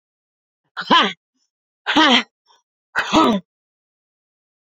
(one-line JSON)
{"exhalation_length": "4.8 s", "exhalation_amplitude": 29046, "exhalation_signal_mean_std_ratio": 0.35, "survey_phase": "beta (2021-08-13 to 2022-03-07)", "age": "45-64", "gender": "Female", "wearing_mask": "No", "symptom_cough_any": true, "symptom_runny_or_blocked_nose": true, "symptom_sore_throat": true, "symptom_diarrhoea": true, "symptom_fatigue": true, "symptom_other": true, "smoker_status": "Current smoker (1 to 10 cigarettes per day)", "respiratory_condition_asthma": false, "respiratory_condition_other": false, "recruitment_source": "Test and Trace", "submission_delay": "2 days", "covid_test_result": "Positive", "covid_test_method": "RT-qPCR", "covid_ct_value": 33.9, "covid_ct_gene": "ORF1ab gene"}